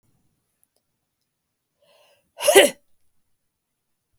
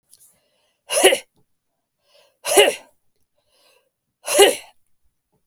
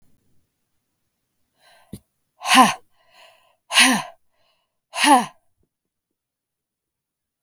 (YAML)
cough_length: 4.2 s
cough_amplitude: 32766
cough_signal_mean_std_ratio: 0.19
three_cough_length: 5.5 s
three_cough_amplitude: 32766
three_cough_signal_mean_std_ratio: 0.28
exhalation_length: 7.4 s
exhalation_amplitude: 32766
exhalation_signal_mean_std_ratio: 0.26
survey_phase: beta (2021-08-13 to 2022-03-07)
age: 45-64
gender: Female
wearing_mask: 'No'
symptom_none: true
smoker_status: Never smoked
respiratory_condition_asthma: false
respiratory_condition_other: false
recruitment_source: REACT
submission_delay: 2 days
covid_test_result: Negative
covid_test_method: RT-qPCR
influenza_a_test_result: Negative
influenza_b_test_result: Negative